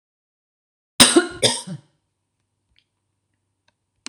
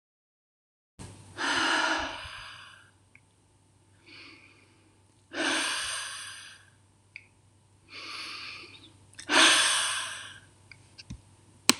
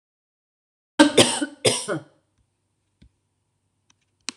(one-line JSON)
{"cough_length": "4.1 s", "cough_amplitude": 26028, "cough_signal_mean_std_ratio": 0.23, "exhalation_length": "11.8 s", "exhalation_amplitude": 26028, "exhalation_signal_mean_std_ratio": 0.39, "three_cough_length": "4.4 s", "three_cough_amplitude": 26028, "three_cough_signal_mean_std_ratio": 0.27, "survey_phase": "alpha (2021-03-01 to 2021-08-12)", "age": "65+", "gender": "Female", "wearing_mask": "No", "symptom_none": true, "smoker_status": "Never smoked", "respiratory_condition_asthma": false, "respiratory_condition_other": false, "recruitment_source": "REACT", "submission_delay": "2 days", "covid_test_result": "Negative", "covid_test_method": "RT-qPCR"}